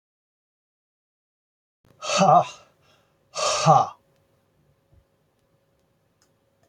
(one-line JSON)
{"exhalation_length": "6.7 s", "exhalation_amplitude": 19763, "exhalation_signal_mean_std_ratio": 0.28, "survey_phase": "beta (2021-08-13 to 2022-03-07)", "age": "45-64", "gender": "Male", "wearing_mask": "No", "symptom_none": true, "symptom_onset": "13 days", "smoker_status": "Never smoked", "respiratory_condition_asthma": false, "respiratory_condition_other": false, "recruitment_source": "REACT", "submission_delay": "2 days", "covid_test_result": "Negative", "covid_test_method": "RT-qPCR", "influenza_a_test_result": "Negative", "influenza_b_test_result": "Negative"}